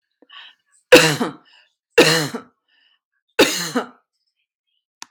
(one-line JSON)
{"three_cough_length": "5.1 s", "three_cough_amplitude": 32768, "three_cough_signal_mean_std_ratio": 0.31, "survey_phase": "beta (2021-08-13 to 2022-03-07)", "age": "45-64", "gender": "Female", "wearing_mask": "No", "symptom_none": true, "smoker_status": "Never smoked", "respiratory_condition_asthma": false, "respiratory_condition_other": false, "recruitment_source": "REACT", "submission_delay": "1 day", "covid_test_result": "Negative", "covid_test_method": "RT-qPCR"}